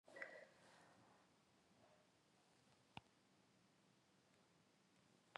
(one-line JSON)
{"exhalation_length": "5.4 s", "exhalation_amplitude": 896, "exhalation_signal_mean_std_ratio": 0.46, "survey_phase": "beta (2021-08-13 to 2022-03-07)", "age": "18-44", "gender": "Female", "wearing_mask": "No", "symptom_runny_or_blocked_nose": true, "symptom_sore_throat": true, "symptom_fatigue": true, "symptom_change_to_sense_of_smell_or_taste": true, "smoker_status": "Never smoked", "respiratory_condition_asthma": false, "respiratory_condition_other": false, "recruitment_source": "Test and Trace", "submission_delay": "2 days", "covid_test_result": "Positive", "covid_test_method": "ePCR"}